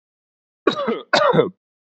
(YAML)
cough_length: 2.0 s
cough_amplitude: 28422
cough_signal_mean_std_ratio: 0.44
survey_phase: beta (2021-08-13 to 2022-03-07)
age: 18-44
gender: Male
wearing_mask: 'No'
symptom_cough_any: true
symptom_runny_or_blocked_nose: true
symptom_sore_throat: true
symptom_fatigue: true
smoker_status: Never smoked
respiratory_condition_asthma: false
respiratory_condition_other: false
recruitment_source: Test and Trace
submission_delay: 1 day
covid_test_result: Positive
covid_test_method: RT-qPCR
covid_ct_value: 27.0
covid_ct_gene: N gene